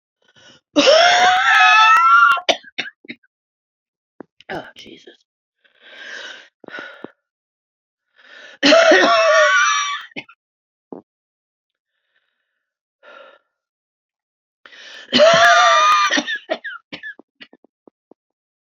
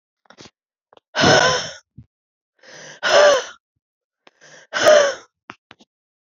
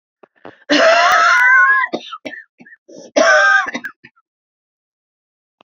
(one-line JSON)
{"three_cough_length": "18.7 s", "three_cough_amplitude": 30511, "three_cough_signal_mean_std_ratio": 0.43, "exhalation_length": "6.3 s", "exhalation_amplitude": 28404, "exhalation_signal_mean_std_ratio": 0.37, "cough_length": "5.6 s", "cough_amplitude": 31206, "cough_signal_mean_std_ratio": 0.53, "survey_phase": "beta (2021-08-13 to 2022-03-07)", "age": "45-64", "gender": "Female", "wearing_mask": "No", "symptom_cough_any": true, "symptom_runny_or_blocked_nose": true, "symptom_shortness_of_breath": true, "symptom_sore_throat": true, "symptom_fatigue": true, "symptom_fever_high_temperature": true, "symptom_headache": true, "symptom_change_to_sense_of_smell_or_taste": true, "smoker_status": "Ex-smoker", "respiratory_condition_asthma": false, "respiratory_condition_other": false, "recruitment_source": "Test and Trace", "submission_delay": "2 days", "covid_test_result": "Positive", "covid_test_method": "RT-qPCR", "covid_ct_value": 15.1, "covid_ct_gene": "ORF1ab gene", "covid_ct_mean": 15.3, "covid_viral_load": "9300000 copies/ml", "covid_viral_load_category": "High viral load (>1M copies/ml)"}